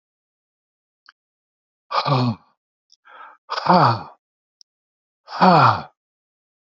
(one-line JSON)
{"exhalation_length": "6.7 s", "exhalation_amplitude": 29387, "exhalation_signal_mean_std_ratio": 0.33, "survey_phase": "beta (2021-08-13 to 2022-03-07)", "age": "65+", "gender": "Male", "wearing_mask": "No", "symptom_none": true, "smoker_status": "Never smoked", "respiratory_condition_asthma": false, "respiratory_condition_other": false, "recruitment_source": "REACT", "submission_delay": "2 days", "covid_test_result": "Negative", "covid_test_method": "RT-qPCR", "influenza_a_test_result": "Negative", "influenza_b_test_result": "Negative"}